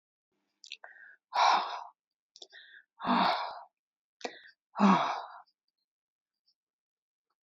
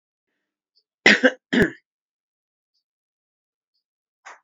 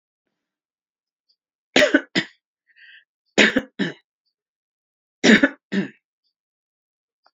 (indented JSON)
{
  "exhalation_length": "7.4 s",
  "exhalation_amplitude": 8206,
  "exhalation_signal_mean_std_ratio": 0.34,
  "cough_length": "4.4 s",
  "cough_amplitude": 27923,
  "cough_signal_mean_std_ratio": 0.21,
  "three_cough_length": "7.3 s",
  "three_cough_amplitude": 32681,
  "three_cough_signal_mean_std_ratio": 0.26,
  "survey_phase": "beta (2021-08-13 to 2022-03-07)",
  "age": "65+",
  "gender": "Female",
  "wearing_mask": "No",
  "symptom_none": true,
  "smoker_status": "Ex-smoker",
  "respiratory_condition_asthma": false,
  "respiratory_condition_other": false,
  "recruitment_source": "REACT",
  "submission_delay": "2 days",
  "covid_test_result": "Negative",
  "covid_test_method": "RT-qPCR",
  "influenza_a_test_result": "Negative",
  "influenza_b_test_result": "Negative"
}